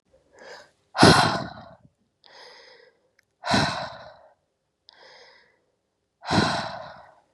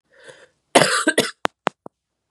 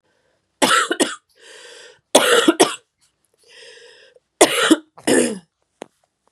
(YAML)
exhalation_length: 7.3 s
exhalation_amplitude: 29554
exhalation_signal_mean_std_ratio: 0.32
cough_length: 2.3 s
cough_amplitude: 32768
cough_signal_mean_std_ratio: 0.32
three_cough_length: 6.3 s
three_cough_amplitude: 32768
three_cough_signal_mean_std_ratio: 0.38
survey_phase: beta (2021-08-13 to 2022-03-07)
age: 18-44
gender: Female
wearing_mask: 'No'
symptom_cough_any: true
symptom_new_continuous_cough: true
symptom_runny_or_blocked_nose: true
symptom_shortness_of_breath: true
symptom_sore_throat: true
symptom_headache: true
symptom_other: true
symptom_onset: 3 days
smoker_status: Ex-smoker
respiratory_condition_asthma: true
respiratory_condition_other: false
recruitment_source: Test and Trace
submission_delay: 1 day
covid_test_result: Positive
covid_test_method: RT-qPCR
covid_ct_value: 18.1
covid_ct_gene: N gene
covid_ct_mean: 19.7
covid_viral_load: 340000 copies/ml
covid_viral_load_category: Low viral load (10K-1M copies/ml)